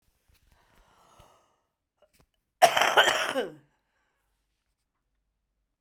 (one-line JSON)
{"cough_length": "5.8 s", "cough_amplitude": 20116, "cough_signal_mean_std_ratio": 0.25, "survey_phase": "alpha (2021-03-01 to 2021-08-12)", "age": "65+", "gender": "Female", "wearing_mask": "No", "symptom_headache": true, "smoker_status": "Never smoked", "respiratory_condition_asthma": true, "respiratory_condition_other": false, "recruitment_source": "Test and Trace", "submission_delay": "1 day", "covid_test_result": "Positive", "covid_test_method": "RT-qPCR", "covid_ct_value": 15.9, "covid_ct_gene": "ORF1ab gene", "covid_ct_mean": 16.6, "covid_viral_load": "3600000 copies/ml", "covid_viral_load_category": "High viral load (>1M copies/ml)"}